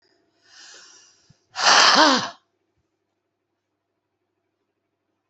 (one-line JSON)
{"exhalation_length": "5.3 s", "exhalation_amplitude": 29143, "exhalation_signal_mean_std_ratio": 0.28, "survey_phase": "beta (2021-08-13 to 2022-03-07)", "age": "45-64", "gender": "Female", "wearing_mask": "No", "symptom_cough_any": true, "symptom_onset": "5 days", "smoker_status": "Current smoker (1 to 10 cigarettes per day)", "respiratory_condition_asthma": false, "respiratory_condition_other": false, "recruitment_source": "REACT", "submission_delay": "3 days", "covid_test_result": "Negative", "covid_test_method": "RT-qPCR"}